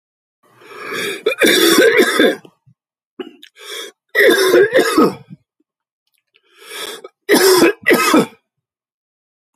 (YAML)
three_cough_length: 9.6 s
three_cough_amplitude: 32767
three_cough_signal_mean_std_ratio: 0.5
survey_phase: beta (2021-08-13 to 2022-03-07)
age: 45-64
gender: Male
wearing_mask: 'No'
symptom_cough_any: true
symptom_runny_or_blocked_nose: true
symptom_headache: true
symptom_onset: 4 days
smoker_status: Ex-smoker
respiratory_condition_asthma: false
respiratory_condition_other: false
recruitment_source: Test and Trace
submission_delay: 1 day
covid_test_result: Positive
covid_test_method: RT-qPCR
covid_ct_value: 31.3
covid_ct_gene: N gene